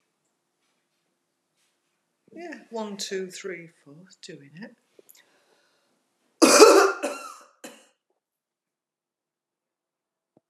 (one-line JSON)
{"cough_length": "10.5 s", "cough_amplitude": 32767, "cough_signal_mean_std_ratio": 0.23, "survey_phase": "beta (2021-08-13 to 2022-03-07)", "age": "65+", "gender": "Female", "wearing_mask": "No", "symptom_none": true, "smoker_status": "Never smoked", "respiratory_condition_asthma": false, "respiratory_condition_other": false, "recruitment_source": "REACT", "submission_delay": "16 days", "covid_test_result": "Negative", "covid_test_method": "RT-qPCR"}